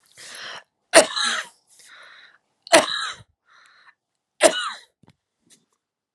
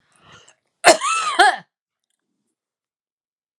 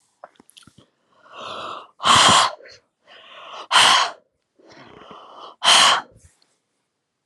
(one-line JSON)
{"three_cough_length": "6.1 s", "three_cough_amplitude": 32768, "three_cough_signal_mean_std_ratio": 0.28, "cough_length": "3.6 s", "cough_amplitude": 32768, "cough_signal_mean_std_ratio": 0.29, "exhalation_length": "7.3 s", "exhalation_amplitude": 28777, "exhalation_signal_mean_std_ratio": 0.37, "survey_phase": "alpha (2021-03-01 to 2021-08-12)", "age": "18-44", "gender": "Female", "wearing_mask": "No", "symptom_none": true, "smoker_status": "Never smoked", "respiratory_condition_asthma": false, "respiratory_condition_other": false, "recruitment_source": "Test and Trace", "submission_delay": "2 days", "covid_test_result": "Positive", "covid_test_method": "RT-qPCR", "covid_ct_value": 25.8, "covid_ct_gene": "ORF1ab gene", "covid_ct_mean": 26.3, "covid_viral_load": "2400 copies/ml", "covid_viral_load_category": "Minimal viral load (< 10K copies/ml)"}